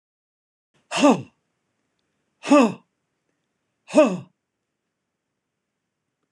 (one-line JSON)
{"exhalation_length": "6.3 s", "exhalation_amplitude": 25142, "exhalation_signal_mean_std_ratio": 0.25, "survey_phase": "beta (2021-08-13 to 2022-03-07)", "age": "45-64", "gender": "Male", "wearing_mask": "No", "symptom_none": true, "symptom_onset": "8 days", "smoker_status": "Never smoked", "respiratory_condition_asthma": false, "respiratory_condition_other": false, "recruitment_source": "REACT", "submission_delay": "1 day", "covid_test_result": "Negative", "covid_test_method": "RT-qPCR"}